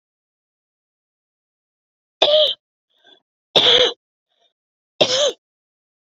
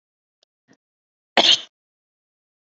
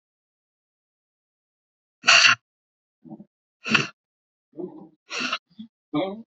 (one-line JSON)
{"three_cough_length": "6.1 s", "three_cough_amplitude": 32767, "three_cough_signal_mean_std_ratio": 0.32, "cough_length": "2.7 s", "cough_amplitude": 27948, "cough_signal_mean_std_ratio": 0.21, "exhalation_length": "6.3 s", "exhalation_amplitude": 26964, "exhalation_signal_mean_std_ratio": 0.27, "survey_phase": "beta (2021-08-13 to 2022-03-07)", "age": "45-64", "gender": "Female", "wearing_mask": "No", "symptom_cough_any": true, "symptom_runny_or_blocked_nose": true, "symptom_fatigue": true, "symptom_onset": "3 days", "smoker_status": "Ex-smoker", "respiratory_condition_asthma": false, "respiratory_condition_other": false, "recruitment_source": "Test and Trace", "submission_delay": "1 day", "covid_test_result": "Positive", "covid_test_method": "RT-qPCR", "covid_ct_value": 17.6, "covid_ct_gene": "N gene"}